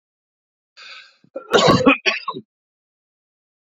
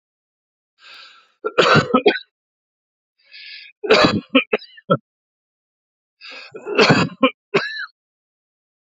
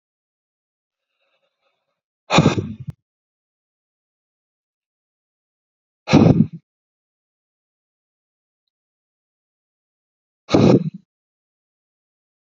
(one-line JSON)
{"cough_length": "3.7 s", "cough_amplitude": 28278, "cough_signal_mean_std_ratio": 0.32, "three_cough_length": "9.0 s", "three_cough_amplitude": 32768, "three_cough_signal_mean_std_ratio": 0.35, "exhalation_length": "12.5 s", "exhalation_amplitude": 32767, "exhalation_signal_mean_std_ratio": 0.22, "survey_phase": "beta (2021-08-13 to 2022-03-07)", "age": "45-64", "gender": "Male", "wearing_mask": "No", "symptom_none": true, "smoker_status": "Ex-smoker", "respiratory_condition_asthma": false, "respiratory_condition_other": false, "recruitment_source": "REACT", "submission_delay": "2 days", "covid_test_result": "Negative", "covid_test_method": "RT-qPCR", "influenza_a_test_result": "Negative", "influenza_b_test_result": "Negative"}